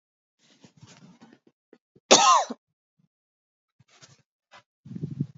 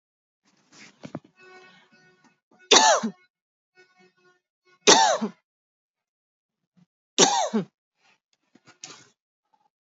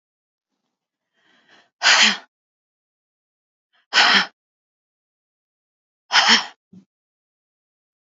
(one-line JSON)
{"cough_length": "5.4 s", "cough_amplitude": 29695, "cough_signal_mean_std_ratio": 0.23, "three_cough_length": "9.8 s", "three_cough_amplitude": 32682, "three_cough_signal_mean_std_ratio": 0.26, "exhalation_length": "8.2 s", "exhalation_amplitude": 30577, "exhalation_signal_mean_std_ratio": 0.27, "survey_phase": "alpha (2021-03-01 to 2021-08-12)", "age": "45-64", "gender": "Female", "wearing_mask": "No", "symptom_none": true, "smoker_status": "Never smoked", "respiratory_condition_asthma": false, "respiratory_condition_other": false, "recruitment_source": "REACT", "submission_delay": "1 day", "covid_test_result": "Negative", "covid_test_method": "RT-qPCR"}